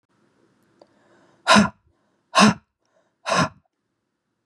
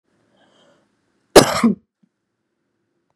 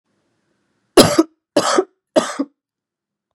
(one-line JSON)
{"exhalation_length": "4.5 s", "exhalation_amplitude": 29987, "exhalation_signal_mean_std_ratio": 0.28, "cough_length": "3.2 s", "cough_amplitude": 32768, "cough_signal_mean_std_ratio": 0.22, "three_cough_length": "3.3 s", "three_cough_amplitude": 32768, "three_cough_signal_mean_std_ratio": 0.32, "survey_phase": "beta (2021-08-13 to 2022-03-07)", "age": "18-44", "gender": "Female", "wearing_mask": "No", "symptom_cough_any": true, "symptom_fatigue": true, "symptom_onset": "3 days", "smoker_status": "Current smoker (1 to 10 cigarettes per day)", "respiratory_condition_asthma": false, "respiratory_condition_other": false, "recruitment_source": "Test and Trace", "submission_delay": "1 day", "covid_test_result": "Negative", "covid_test_method": "RT-qPCR"}